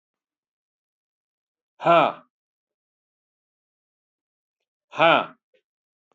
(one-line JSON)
{"exhalation_length": "6.1 s", "exhalation_amplitude": 23227, "exhalation_signal_mean_std_ratio": 0.22, "survey_phase": "alpha (2021-03-01 to 2021-08-12)", "age": "65+", "gender": "Male", "wearing_mask": "No", "symptom_none": true, "smoker_status": "Ex-smoker", "respiratory_condition_asthma": false, "respiratory_condition_other": false, "recruitment_source": "REACT", "submission_delay": "2 days", "covid_test_result": "Negative", "covid_test_method": "RT-qPCR"}